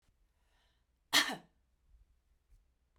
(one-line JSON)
{"cough_length": "3.0 s", "cough_amplitude": 7613, "cough_signal_mean_std_ratio": 0.2, "survey_phase": "beta (2021-08-13 to 2022-03-07)", "age": "45-64", "gender": "Female", "wearing_mask": "No", "symptom_none": true, "smoker_status": "Never smoked", "respiratory_condition_asthma": false, "respiratory_condition_other": false, "recruitment_source": "REACT", "submission_delay": "2 days", "covid_test_result": "Negative", "covid_test_method": "RT-qPCR"}